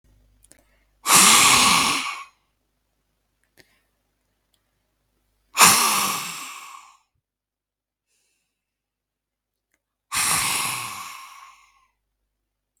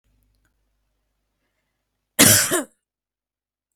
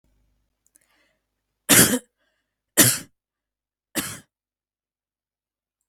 {"exhalation_length": "12.8 s", "exhalation_amplitude": 32768, "exhalation_signal_mean_std_ratio": 0.34, "cough_length": "3.8 s", "cough_amplitude": 32768, "cough_signal_mean_std_ratio": 0.24, "three_cough_length": "5.9 s", "three_cough_amplitude": 32768, "three_cough_signal_mean_std_ratio": 0.23, "survey_phase": "beta (2021-08-13 to 2022-03-07)", "age": "45-64", "gender": "Female", "wearing_mask": "No", "symptom_none": true, "smoker_status": "Ex-smoker", "respiratory_condition_asthma": true, "respiratory_condition_other": false, "recruitment_source": "REACT", "submission_delay": "1 day", "covid_test_result": "Negative", "covid_test_method": "RT-qPCR", "influenza_a_test_result": "Negative", "influenza_b_test_result": "Negative"}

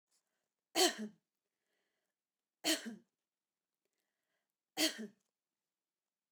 {"three_cough_length": "6.3 s", "three_cough_amplitude": 4719, "three_cough_signal_mean_std_ratio": 0.24, "survey_phase": "beta (2021-08-13 to 2022-03-07)", "age": "45-64", "gender": "Female", "wearing_mask": "No", "symptom_none": true, "smoker_status": "Never smoked", "respiratory_condition_asthma": false, "respiratory_condition_other": false, "recruitment_source": "REACT", "submission_delay": "2 days", "covid_test_result": "Negative", "covid_test_method": "RT-qPCR"}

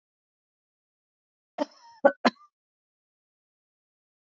{"cough_length": "4.4 s", "cough_amplitude": 20207, "cough_signal_mean_std_ratio": 0.13, "survey_phase": "beta (2021-08-13 to 2022-03-07)", "age": "45-64", "gender": "Female", "wearing_mask": "No", "symptom_none": true, "smoker_status": "Never smoked", "respiratory_condition_asthma": false, "respiratory_condition_other": false, "recruitment_source": "REACT", "submission_delay": "3 days", "covid_test_result": "Negative", "covid_test_method": "RT-qPCR", "influenza_a_test_result": "Negative", "influenza_b_test_result": "Negative"}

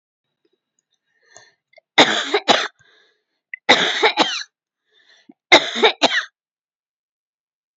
{"three_cough_length": "7.8 s", "three_cough_amplitude": 32767, "three_cough_signal_mean_std_ratio": 0.33, "survey_phase": "beta (2021-08-13 to 2022-03-07)", "age": "65+", "gender": "Female", "wearing_mask": "No", "symptom_none": true, "smoker_status": "Ex-smoker", "respiratory_condition_asthma": false, "respiratory_condition_other": false, "recruitment_source": "REACT", "submission_delay": "1 day", "covid_test_result": "Negative", "covid_test_method": "RT-qPCR", "influenza_a_test_result": "Negative", "influenza_b_test_result": "Negative"}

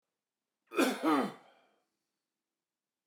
{"cough_length": "3.1 s", "cough_amplitude": 4949, "cough_signal_mean_std_ratio": 0.33, "survey_phase": "beta (2021-08-13 to 2022-03-07)", "age": "65+", "gender": "Male", "wearing_mask": "No", "symptom_runny_or_blocked_nose": true, "smoker_status": "Never smoked", "respiratory_condition_asthma": false, "respiratory_condition_other": false, "recruitment_source": "REACT", "submission_delay": "1 day", "covid_test_result": "Negative", "covid_test_method": "RT-qPCR"}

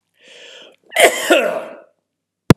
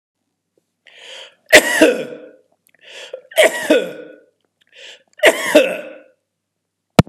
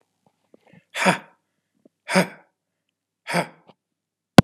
{"cough_length": "2.6 s", "cough_amplitude": 32768, "cough_signal_mean_std_ratio": 0.36, "three_cough_length": "7.1 s", "three_cough_amplitude": 32768, "three_cough_signal_mean_std_ratio": 0.34, "exhalation_length": "4.4 s", "exhalation_amplitude": 32768, "exhalation_signal_mean_std_ratio": 0.2, "survey_phase": "beta (2021-08-13 to 2022-03-07)", "age": "45-64", "gender": "Male", "wearing_mask": "No", "symptom_runny_or_blocked_nose": true, "symptom_fatigue": true, "smoker_status": "Ex-smoker", "respiratory_condition_asthma": false, "respiratory_condition_other": false, "recruitment_source": "REACT", "submission_delay": "1 day", "covid_test_result": "Negative", "covid_test_method": "RT-qPCR", "influenza_a_test_result": "Negative", "influenza_b_test_result": "Negative"}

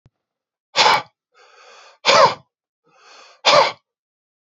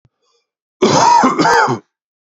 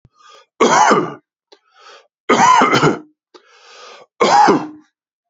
{"exhalation_length": "4.4 s", "exhalation_amplitude": 29901, "exhalation_signal_mean_std_ratio": 0.34, "cough_length": "2.3 s", "cough_amplitude": 30972, "cough_signal_mean_std_ratio": 0.58, "three_cough_length": "5.3 s", "three_cough_amplitude": 30632, "three_cough_signal_mean_std_ratio": 0.48, "survey_phase": "beta (2021-08-13 to 2022-03-07)", "age": "45-64", "gender": "Male", "wearing_mask": "No", "symptom_runny_or_blocked_nose": true, "smoker_status": "Ex-smoker", "respiratory_condition_asthma": false, "respiratory_condition_other": false, "recruitment_source": "REACT", "submission_delay": "0 days", "covid_test_result": "Negative", "covid_test_method": "RT-qPCR", "influenza_a_test_result": "Unknown/Void", "influenza_b_test_result": "Unknown/Void"}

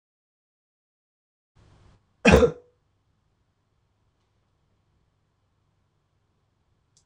{"cough_length": "7.1 s", "cough_amplitude": 26028, "cough_signal_mean_std_ratio": 0.15, "survey_phase": "beta (2021-08-13 to 2022-03-07)", "age": "18-44", "gender": "Male", "wearing_mask": "No", "symptom_new_continuous_cough": true, "symptom_runny_or_blocked_nose": true, "symptom_sore_throat": true, "symptom_diarrhoea": true, "symptom_fatigue": true, "symptom_headache": true, "symptom_onset": "2 days", "smoker_status": "Never smoked", "respiratory_condition_asthma": false, "respiratory_condition_other": false, "recruitment_source": "Test and Trace", "submission_delay": "1 day", "covid_test_result": "Positive", "covid_test_method": "RT-qPCR", "covid_ct_value": 23.5, "covid_ct_gene": "N gene"}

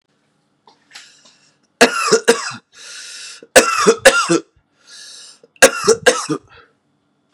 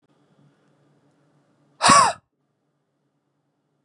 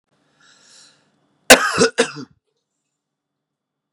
{"three_cough_length": "7.3 s", "three_cough_amplitude": 32768, "three_cough_signal_mean_std_ratio": 0.37, "exhalation_length": "3.8 s", "exhalation_amplitude": 30293, "exhalation_signal_mean_std_ratio": 0.23, "cough_length": "3.9 s", "cough_amplitude": 32768, "cough_signal_mean_std_ratio": 0.23, "survey_phase": "beta (2021-08-13 to 2022-03-07)", "age": "18-44", "gender": "Male", "wearing_mask": "No", "symptom_cough_any": true, "symptom_runny_or_blocked_nose": true, "symptom_fatigue": true, "symptom_headache": true, "symptom_onset": "4 days", "smoker_status": "Never smoked", "respiratory_condition_asthma": false, "respiratory_condition_other": false, "recruitment_source": "Test and Trace", "submission_delay": "2 days", "covid_test_result": "Positive", "covid_test_method": "RT-qPCR", "covid_ct_value": 25.1, "covid_ct_gene": "ORF1ab gene", "covid_ct_mean": 25.6, "covid_viral_load": "3900 copies/ml", "covid_viral_load_category": "Minimal viral load (< 10K copies/ml)"}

